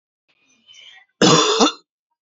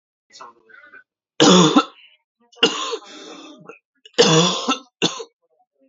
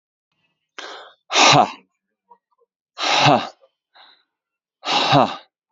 {
  "cough_length": "2.2 s",
  "cough_amplitude": 28706,
  "cough_signal_mean_std_ratio": 0.39,
  "three_cough_length": "5.9 s",
  "three_cough_amplitude": 31485,
  "three_cough_signal_mean_std_ratio": 0.38,
  "exhalation_length": "5.7 s",
  "exhalation_amplitude": 32767,
  "exhalation_signal_mean_std_ratio": 0.37,
  "survey_phase": "alpha (2021-03-01 to 2021-08-12)",
  "age": "18-44",
  "gender": "Male",
  "wearing_mask": "No",
  "symptom_cough_any": true,
  "symptom_fatigue": true,
  "symptom_headache": true,
  "symptom_change_to_sense_of_smell_or_taste": true,
  "symptom_loss_of_taste": true,
  "symptom_onset": "4 days",
  "smoker_status": "Ex-smoker",
  "respiratory_condition_asthma": false,
  "respiratory_condition_other": false,
  "recruitment_source": "Test and Trace",
  "submission_delay": "2 days",
  "covid_test_result": "Positive",
  "covid_test_method": "RT-qPCR",
  "covid_ct_value": 17.0,
  "covid_ct_gene": "ORF1ab gene",
  "covid_ct_mean": 17.5,
  "covid_viral_load": "1900000 copies/ml",
  "covid_viral_load_category": "High viral load (>1M copies/ml)"
}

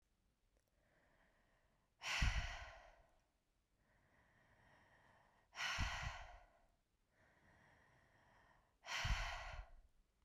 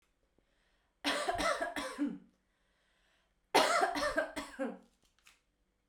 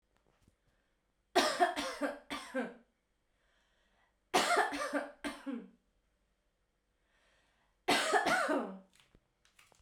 {
  "exhalation_length": "10.2 s",
  "exhalation_amplitude": 1819,
  "exhalation_signal_mean_std_ratio": 0.38,
  "cough_length": "5.9 s",
  "cough_amplitude": 6781,
  "cough_signal_mean_std_ratio": 0.46,
  "three_cough_length": "9.8 s",
  "three_cough_amplitude": 6311,
  "three_cough_signal_mean_std_ratio": 0.41,
  "survey_phase": "beta (2021-08-13 to 2022-03-07)",
  "age": "18-44",
  "gender": "Female",
  "wearing_mask": "No",
  "symptom_cough_any": true,
  "symptom_runny_or_blocked_nose": true,
  "symptom_sore_throat": true,
  "symptom_diarrhoea": true,
  "symptom_fatigue": true,
  "symptom_fever_high_temperature": true,
  "symptom_headache": true,
  "symptom_change_to_sense_of_smell_or_taste": true,
  "symptom_onset": "6 days",
  "smoker_status": "Never smoked",
  "respiratory_condition_asthma": false,
  "respiratory_condition_other": false,
  "recruitment_source": "Test and Trace",
  "submission_delay": "2 days",
  "covid_test_result": "Positive",
  "covid_test_method": "RT-qPCR"
}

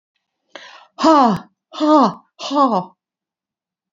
{
  "exhalation_length": "3.9 s",
  "exhalation_amplitude": 28461,
  "exhalation_signal_mean_std_ratio": 0.43,
  "survey_phase": "beta (2021-08-13 to 2022-03-07)",
  "age": "45-64",
  "gender": "Female",
  "wearing_mask": "No",
  "symptom_none": true,
  "smoker_status": "Never smoked",
  "respiratory_condition_asthma": false,
  "respiratory_condition_other": false,
  "recruitment_source": "REACT",
  "submission_delay": "2 days",
  "covid_test_result": "Negative",
  "covid_test_method": "RT-qPCR",
  "influenza_a_test_result": "Negative",
  "influenza_b_test_result": "Negative"
}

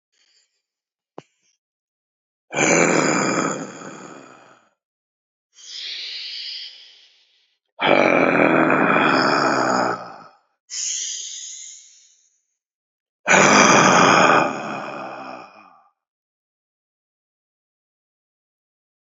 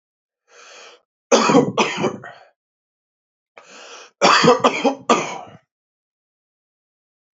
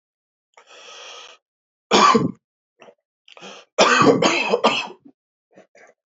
{
  "exhalation_length": "19.2 s",
  "exhalation_amplitude": 32053,
  "exhalation_signal_mean_std_ratio": 0.44,
  "three_cough_length": "7.3 s",
  "three_cough_amplitude": 28866,
  "three_cough_signal_mean_std_ratio": 0.37,
  "cough_length": "6.1 s",
  "cough_amplitude": 30342,
  "cough_signal_mean_std_ratio": 0.39,
  "survey_phase": "alpha (2021-03-01 to 2021-08-12)",
  "age": "18-44",
  "gender": "Male",
  "wearing_mask": "No",
  "symptom_none": true,
  "smoker_status": "Current smoker (1 to 10 cigarettes per day)",
  "respiratory_condition_asthma": false,
  "respiratory_condition_other": false,
  "recruitment_source": "REACT",
  "submission_delay": "1 day",
  "covid_test_result": "Negative",
  "covid_test_method": "RT-qPCR"
}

